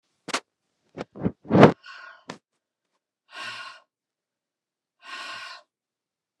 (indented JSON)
{
  "exhalation_length": "6.4 s",
  "exhalation_amplitude": 29203,
  "exhalation_signal_mean_std_ratio": 0.21,
  "survey_phase": "beta (2021-08-13 to 2022-03-07)",
  "age": "65+",
  "gender": "Female",
  "wearing_mask": "No",
  "symptom_none": true,
  "smoker_status": "Never smoked",
  "respiratory_condition_asthma": false,
  "respiratory_condition_other": false,
  "recruitment_source": "REACT",
  "submission_delay": "3 days",
  "covid_test_result": "Negative",
  "covid_test_method": "RT-qPCR",
  "influenza_a_test_result": "Negative",
  "influenza_b_test_result": "Negative"
}